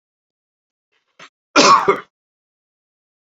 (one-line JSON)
{"cough_length": "3.2 s", "cough_amplitude": 30768, "cough_signal_mean_std_ratio": 0.27, "survey_phase": "beta (2021-08-13 to 2022-03-07)", "age": "45-64", "gender": "Male", "wearing_mask": "No", "symptom_none": true, "smoker_status": "Current smoker (1 to 10 cigarettes per day)", "respiratory_condition_asthma": false, "respiratory_condition_other": false, "recruitment_source": "REACT", "submission_delay": "1 day", "covid_test_result": "Negative", "covid_test_method": "RT-qPCR"}